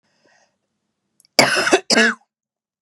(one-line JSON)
{"cough_length": "2.8 s", "cough_amplitude": 32768, "cough_signal_mean_std_ratio": 0.36, "survey_phase": "beta (2021-08-13 to 2022-03-07)", "age": "45-64", "gender": "Female", "wearing_mask": "No", "symptom_cough_any": true, "symptom_sore_throat": true, "symptom_headache": true, "symptom_other": true, "symptom_onset": "8 days", "smoker_status": "Never smoked", "respiratory_condition_asthma": false, "respiratory_condition_other": false, "recruitment_source": "Test and Trace", "submission_delay": "2 days", "covid_test_result": "Positive", "covid_test_method": "RT-qPCR", "covid_ct_value": 32.7, "covid_ct_gene": "N gene"}